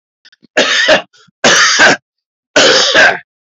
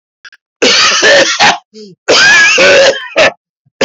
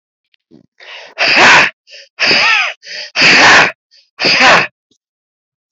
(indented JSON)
{
  "three_cough_length": "3.5 s",
  "three_cough_amplitude": 32768,
  "three_cough_signal_mean_std_ratio": 0.64,
  "cough_length": "3.8 s",
  "cough_amplitude": 32768,
  "cough_signal_mean_std_ratio": 0.79,
  "exhalation_length": "5.7 s",
  "exhalation_amplitude": 32768,
  "exhalation_signal_mean_std_ratio": 0.56,
  "survey_phase": "beta (2021-08-13 to 2022-03-07)",
  "age": "45-64",
  "gender": "Male",
  "wearing_mask": "Yes",
  "symptom_change_to_sense_of_smell_or_taste": true,
  "smoker_status": "Ex-smoker",
  "respiratory_condition_asthma": false,
  "respiratory_condition_other": false,
  "recruitment_source": "REACT",
  "submission_delay": "5 days",
  "covid_test_result": "Negative",
  "covid_test_method": "RT-qPCR",
  "influenza_a_test_result": "Unknown/Void",
  "influenza_b_test_result": "Unknown/Void"
}